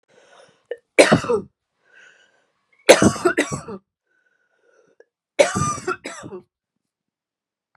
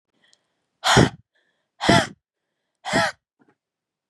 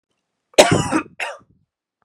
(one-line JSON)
{"three_cough_length": "7.8 s", "three_cough_amplitude": 32768, "three_cough_signal_mean_std_ratio": 0.29, "exhalation_length": "4.1 s", "exhalation_amplitude": 26703, "exhalation_signal_mean_std_ratio": 0.31, "cough_length": "2.0 s", "cough_amplitude": 32768, "cough_signal_mean_std_ratio": 0.33, "survey_phase": "beta (2021-08-13 to 2022-03-07)", "age": "18-44", "gender": "Female", "wearing_mask": "No", "symptom_runny_or_blocked_nose": true, "symptom_fatigue": true, "symptom_other": true, "smoker_status": "Ex-smoker", "respiratory_condition_asthma": true, "respiratory_condition_other": false, "recruitment_source": "Test and Trace", "submission_delay": "1 day", "covid_test_result": "Positive", "covid_test_method": "RT-qPCR", "covid_ct_value": 19.7, "covid_ct_gene": "ORF1ab gene", "covid_ct_mean": 20.2, "covid_viral_load": "230000 copies/ml", "covid_viral_load_category": "Low viral load (10K-1M copies/ml)"}